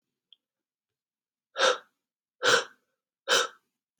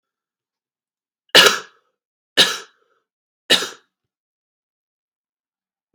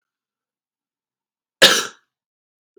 {"exhalation_length": "4.0 s", "exhalation_amplitude": 13243, "exhalation_signal_mean_std_ratio": 0.3, "three_cough_length": "5.9 s", "three_cough_amplitude": 32768, "three_cough_signal_mean_std_ratio": 0.22, "cough_length": "2.8 s", "cough_amplitude": 32768, "cough_signal_mean_std_ratio": 0.2, "survey_phase": "beta (2021-08-13 to 2022-03-07)", "age": "18-44", "gender": "Male", "wearing_mask": "No", "symptom_runny_or_blocked_nose": true, "symptom_sore_throat": true, "symptom_fatigue": true, "symptom_fever_high_temperature": true, "symptom_headache": true, "symptom_other": true, "symptom_onset": "6 days", "smoker_status": "Never smoked", "respiratory_condition_asthma": true, "respiratory_condition_other": false, "recruitment_source": "Test and Trace", "submission_delay": "2 days", "covid_test_result": "Positive", "covid_test_method": "RT-qPCR", "covid_ct_value": 22.4, "covid_ct_gene": "ORF1ab gene", "covid_ct_mean": 22.6, "covid_viral_load": "39000 copies/ml", "covid_viral_load_category": "Low viral load (10K-1M copies/ml)"}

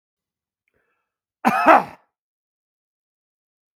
{"cough_length": "3.8 s", "cough_amplitude": 32768, "cough_signal_mean_std_ratio": 0.23, "survey_phase": "beta (2021-08-13 to 2022-03-07)", "age": "45-64", "gender": "Male", "wearing_mask": "No", "symptom_none": true, "smoker_status": "Ex-smoker", "respiratory_condition_asthma": false, "respiratory_condition_other": false, "recruitment_source": "REACT", "submission_delay": "1 day", "covid_test_result": "Negative", "covid_test_method": "RT-qPCR", "influenza_a_test_result": "Negative", "influenza_b_test_result": "Negative"}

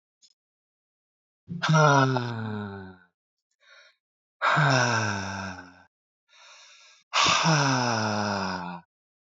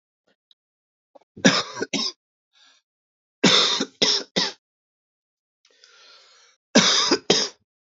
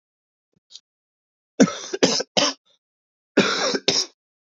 {"exhalation_length": "9.4 s", "exhalation_amplitude": 16630, "exhalation_signal_mean_std_ratio": 0.51, "three_cough_length": "7.9 s", "three_cough_amplitude": 29467, "three_cough_signal_mean_std_ratio": 0.37, "cough_length": "4.5 s", "cough_amplitude": 28860, "cough_signal_mean_std_ratio": 0.37, "survey_phase": "alpha (2021-03-01 to 2021-08-12)", "age": "18-44", "gender": "Male", "wearing_mask": "No", "symptom_cough_any": true, "symptom_fatigue": true, "symptom_headache": true, "symptom_change_to_sense_of_smell_or_taste": true, "symptom_onset": "8 days", "smoker_status": "Current smoker (1 to 10 cigarettes per day)", "respiratory_condition_asthma": false, "respiratory_condition_other": false, "recruitment_source": "Test and Trace", "submission_delay": "2 days", "covid_test_result": "Positive", "covid_test_method": "RT-qPCR", "covid_ct_value": 30.0, "covid_ct_gene": "N gene"}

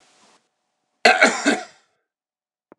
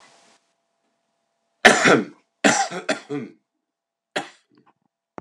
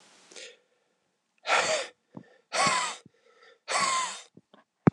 {"cough_length": "2.8 s", "cough_amplitude": 32767, "cough_signal_mean_std_ratio": 0.3, "three_cough_length": "5.2 s", "three_cough_amplitude": 32768, "three_cough_signal_mean_std_ratio": 0.3, "exhalation_length": "4.9 s", "exhalation_amplitude": 15832, "exhalation_signal_mean_std_ratio": 0.4, "survey_phase": "beta (2021-08-13 to 2022-03-07)", "age": "45-64", "gender": "Male", "wearing_mask": "No", "symptom_none": true, "symptom_onset": "2 days", "smoker_status": "Ex-smoker", "respiratory_condition_asthma": false, "respiratory_condition_other": false, "recruitment_source": "Test and Trace", "submission_delay": "2 days", "covid_test_result": "Positive", "covid_test_method": "RT-qPCR", "covid_ct_value": 31.3, "covid_ct_gene": "S gene"}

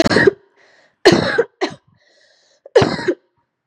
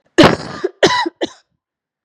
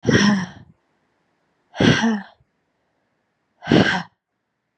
{"three_cough_length": "3.7 s", "three_cough_amplitude": 32768, "three_cough_signal_mean_std_ratio": 0.4, "cough_length": "2.0 s", "cough_amplitude": 32768, "cough_signal_mean_std_ratio": 0.4, "exhalation_length": "4.8 s", "exhalation_amplitude": 30557, "exhalation_signal_mean_std_ratio": 0.39, "survey_phase": "beta (2021-08-13 to 2022-03-07)", "age": "18-44", "gender": "Female", "wearing_mask": "No", "symptom_cough_any": true, "symptom_runny_or_blocked_nose": true, "symptom_diarrhoea": true, "symptom_fatigue": true, "symptom_headache": true, "symptom_change_to_sense_of_smell_or_taste": true, "symptom_onset": "3 days", "smoker_status": "Never smoked", "respiratory_condition_asthma": false, "respiratory_condition_other": false, "recruitment_source": "Test and Trace", "submission_delay": "2 days", "covid_test_result": "Positive", "covid_test_method": "RT-qPCR", "covid_ct_value": 20.3, "covid_ct_gene": "ORF1ab gene"}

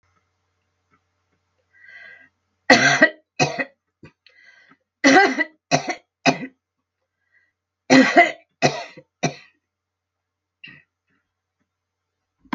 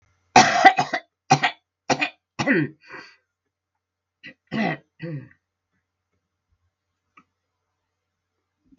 {"three_cough_length": "12.5 s", "three_cough_amplitude": 32768, "three_cough_signal_mean_std_ratio": 0.29, "cough_length": "8.8 s", "cough_amplitude": 32768, "cough_signal_mean_std_ratio": 0.27, "survey_phase": "beta (2021-08-13 to 2022-03-07)", "age": "65+", "gender": "Female", "wearing_mask": "No", "symptom_cough_any": true, "symptom_runny_or_blocked_nose": true, "symptom_sore_throat": true, "symptom_fatigue": true, "symptom_headache": true, "symptom_change_to_sense_of_smell_or_taste": true, "symptom_other": true, "symptom_onset": "3 days", "smoker_status": "Never smoked", "respiratory_condition_asthma": false, "respiratory_condition_other": true, "recruitment_source": "Test and Trace", "submission_delay": "2 days", "covid_test_result": "Positive", "covid_test_method": "RT-qPCR", "covid_ct_value": 14.2, "covid_ct_gene": "ORF1ab gene", "covid_ct_mean": 14.5, "covid_viral_load": "17000000 copies/ml", "covid_viral_load_category": "High viral load (>1M copies/ml)"}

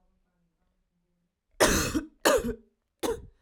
{"three_cough_length": "3.4 s", "three_cough_amplitude": 13797, "three_cough_signal_mean_std_ratio": 0.38, "survey_phase": "alpha (2021-03-01 to 2021-08-12)", "age": "18-44", "gender": "Female", "wearing_mask": "No", "symptom_cough_any": true, "symptom_fatigue": true, "symptom_headache": true, "symptom_change_to_sense_of_smell_or_taste": true, "smoker_status": "Never smoked", "respiratory_condition_asthma": false, "respiratory_condition_other": false, "recruitment_source": "Test and Trace", "submission_delay": "2 days", "covid_test_result": "Positive", "covid_test_method": "RT-qPCR"}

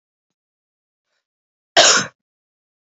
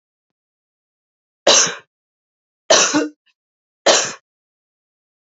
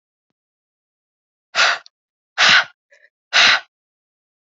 {"cough_length": "2.8 s", "cough_amplitude": 32767, "cough_signal_mean_std_ratio": 0.24, "three_cough_length": "5.2 s", "three_cough_amplitude": 29884, "three_cough_signal_mean_std_ratio": 0.31, "exhalation_length": "4.5 s", "exhalation_amplitude": 32768, "exhalation_signal_mean_std_ratio": 0.32, "survey_phase": "alpha (2021-03-01 to 2021-08-12)", "age": "18-44", "gender": "Female", "wearing_mask": "No", "symptom_fatigue": true, "symptom_fever_high_temperature": true, "symptom_headache": true, "smoker_status": "Never smoked", "respiratory_condition_asthma": false, "respiratory_condition_other": false, "recruitment_source": "Test and Trace", "submission_delay": "2 days", "covid_test_result": "Positive", "covid_test_method": "RT-qPCR", "covid_ct_value": 14.5, "covid_ct_gene": "ORF1ab gene", "covid_ct_mean": 14.9, "covid_viral_load": "13000000 copies/ml", "covid_viral_load_category": "High viral load (>1M copies/ml)"}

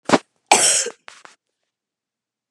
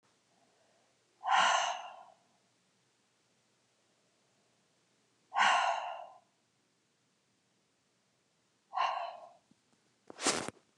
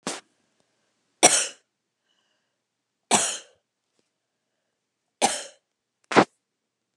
{"cough_length": "2.5 s", "cough_amplitude": 32768, "cough_signal_mean_std_ratio": 0.32, "exhalation_length": "10.8 s", "exhalation_amplitude": 6163, "exhalation_signal_mean_std_ratio": 0.32, "three_cough_length": "7.0 s", "three_cough_amplitude": 32646, "three_cough_signal_mean_std_ratio": 0.23, "survey_phase": "beta (2021-08-13 to 2022-03-07)", "age": "65+", "gender": "Female", "wearing_mask": "No", "symptom_none": true, "smoker_status": "Never smoked", "respiratory_condition_asthma": false, "respiratory_condition_other": false, "recruitment_source": "REACT", "submission_delay": "2 days", "covid_test_result": "Negative", "covid_test_method": "RT-qPCR"}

